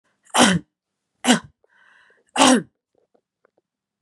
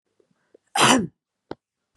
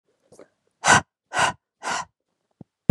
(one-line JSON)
{"three_cough_length": "4.0 s", "three_cough_amplitude": 32767, "three_cough_signal_mean_std_ratio": 0.31, "cough_length": "2.0 s", "cough_amplitude": 29585, "cough_signal_mean_std_ratio": 0.31, "exhalation_length": "2.9 s", "exhalation_amplitude": 28943, "exhalation_signal_mean_std_ratio": 0.29, "survey_phase": "beta (2021-08-13 to 2022-03-07)", "age": "18-44", "gender": "Female", "wearing_mask": "No", "symptom_none": true, "smoker_status": "Ex-smoker", "respiratory_condition_asthma": false, "respiratory_condition_other": false, "recruitment_source": "REACT", "submission_delay": "1 day", "covid_test_result": "Negative", "covid_test_method": "RT-qPCR", "influenza_a_test_result": "Negative", "influenza_b_test_result": "Negative"}